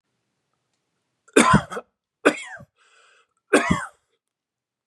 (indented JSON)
{
  "three_cough_length": "4.9 s",
  "three_cough_amplitude": 32156,
  "three_cough_signal_mean_std_ratio": 0.28,
  "survey_phase": "beta (2021-08-13 to 2022-03-07)",
  "age": "18-44",
  "gender": "Male",
  "wearing_mask": "No",
  "symptom_none": true,
  "smoker_status": "Never smoked",
  "respiratory_condition_asthma": false,
  "respiratory_condition_other": false,
  "recruitment_source": "REACT",
  "submission_delay": "1 day",
  "covid_test_result": "Negative",
  "covid_test_method": "RT-qPCR",
  "influenza_a_test_result": "Negative",
  "influenza_b_test_result": "Negative"
}